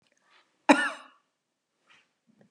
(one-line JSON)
{"cough_length": "2.5 s", "cough_amplitude": 23230, "cough_signal_mean_std_ratio": 0.2, "survey_phase": "beta (2021-08-13 to 2022-03-07)", "age": "65+", "gender": "Female", "wearing_mask": "No", "symptom_none": true, "smoker_status": "Ex-smoker", "respiratory_condition_asthma": false, "respiratory_condition_other": false, "recruitment_source": "REACT", "submission_delay": "5 days", "covid_test_result": "Negative", "covid_test_method": "RT-qPCR", "influenza_a_test_result": "Negative", "influenza_b_test_result": "Negative"}